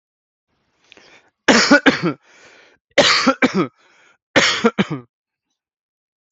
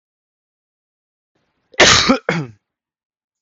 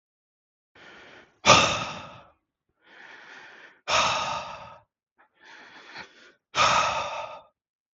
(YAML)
three_cough_length: 6.3 s
three_cough_amplitude: 32768
three_cough_signal_mean_std_ratio: 0.38
cough_length: 3.4 s
cough_amplitude: 32768
cough_signal_mean_std_ratio: 0.3
exhalation_length: 7.9 s
exhalation_amplitude: 30567
exhalation_signal_mean_std_ratio: 0.37
survey_phase: beta (2021-08-13 to 2022-03-07)
age: 18-44
gender: Male
wearing_mask: 'No'
symptom_fever_high_temperature: true
smoker_status: Ex-smoker
respiratory_condition_asthma: false
respiratory_condition_other: false
recruitment_source: Test and Trace
submission_delay: 1 day
covid_test_result: Positive
covid_test_method: RT-qPCR
covid_ct_value: 27.9
covid_ct_gene: N gene